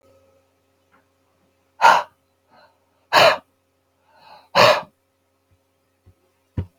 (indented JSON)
{
  "exhalation_length": "6.8 s",
  "exhalation_amplitude": 32768,
  "exhalation_signal_mean_std_ratio": 0.26,
  "survey_phase": "beta (2021-08-13 to 2022-03-07)",
  "age": "45-64",
  "gender": "Male",
  "wearing_mask": "No",
  "symptom_cough_any": true,
  "symptom_fever_high_temperature": true,
  "symptom_onset": "6 days",
  "smoker_status": "Ex-smoker",
  "respiratory_condition_asthma": false,
  "respiratory_condition_other": false,
  "recruitment_source": "Test and Trace",
  "submission_delay": "1 day",
  "covid_test_result": "Positive",
  "covid_test_method": "RT-qPCR",
  "covid_ct_value": 18.8,
  "covid_ct_gene": "N gene"
}